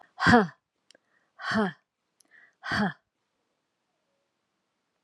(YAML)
exhalation_length: 5.0 s
exhalation_amplitude: 20939
exhalation_signal_mean_std_ratio: 0.28
survey_phase: alpha (2021-03-01 to 2021-08-12)
age: 45-64
gender: Female
wearing_mask: 'No'
symptom_none: true
symptom_onset: 12 days
smoker_status: Never smoked
respiratory_condition_asthma: false
respiratory_condition_other: false
recruitment_source: REACT
submission_delay: 2 days
covid_test_result: Negative
covid_test_method: RT-qPCR